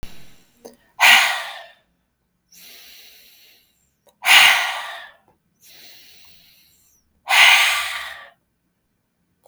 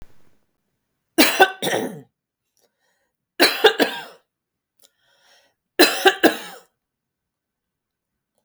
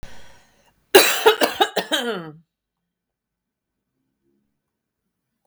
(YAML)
exhalation_length: 9.5 s
exhalation_amplitude: 32768
exhalation_signal_mean_std_ratio: 0.34
three_cough_length: 8.4 s
three_cough_amplitude: 32768
three_cough_signal_mean_std_ratio: 0.29
cough_length: 5.5 s
cough_amplitude: 32768
cough_signal_mean_std_ratio: 0.29
survey_phase: beta (2021-08-13 to 2022-03-07)
age: 45-64
gender: Female
wearing_mask: 'No'
symptom_none: true
smoker_status: Never smoked
respiratory_condition_asthma: false
respiratory_condition_other: false
recruitment_source: REACT
submission_delay: 3 days
covid_test_result: Negative
covid_test_method: RT-qPCR
influenza_a_test_result: Unknown/Void
influenza_b_test_result: Unknown/Void